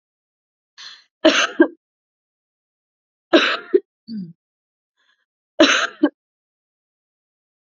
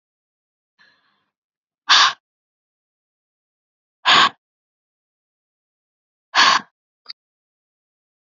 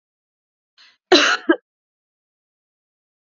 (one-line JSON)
{"three_cough_length": "7.7 s", "three_cough_amplitude": 29329, "three_cough_signal_mean_std_ratio": 0.27, "exhalation_length": "8.3 s", "exhalation_amplitude": 32038, "exhalation_signal_mean_std_ratio": 0.23, "cough_length": "3.3 s", "cough_amplitude": 29915, "cough_signal_mean_std_ratio": 0.24, "survey_phase": "beta (2021-08-13 to 2022-03-07)", "age": "18-44", "gender": "Female", "wearing_mask": "No", "symptom_none": true, "symptom_onset": "12 days", "smoker_status": "Never smoked", "respiratory_condition_asthma": false, "respiratory_condition_other": false, "recruitment_source": "REACT", "submission_delay": "2 days", "covid_test_result": "Negative", "covid_test_method": "RT-qPCR", "influenza_a_test_result": "Negative", "influenza_b_test_result": "Negative"}